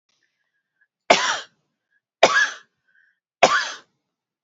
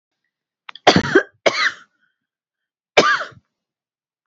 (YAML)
three_cough_length: 4.4 s
three_cough_amplitude: 29957
three_cough_signal_mean_std_ratio: 0.3
cough_length: 4.3 s
cough_amplitude: 29856
cough_signal_mean_std_ratio: 0.31
survey_phase: alpha (2021-03-01 to 2021-08-12)
age: 45-64
gender: Female
wearing_mask: 'No'
symptom_none: true
smoker_status: Ex-smoker
respiratory_condition_asthma: false
respiratory_condition_other: false
recruitment_source: REACT
submission_delay: 1 day
covid_test_result: Negative
covid_test_method: RT-qPCR